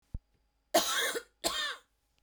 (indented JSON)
{
  "cough_length": "2.2 s",
  "cough_amplitude": 8027,
  "cough_signal_mean_std_ratio": 0.46,
  "survey_phase": "beta (2021-08-13 to 2022-03-07)",
  "age": "18-44",
  "gender": "Female",
  "wearing_mask": "No",
  "symptom_none": true,
  "smoker_status": "Ex-smoker",
  "respiratory_condition_asthma": true,
  "respiratory_condition_other": false,
  "recruitment_source": "REACT",
  "submission_delay": "1 day",
  "covid_test_result": "Negative",
  "covid_test_method": "RT-qPCR"
}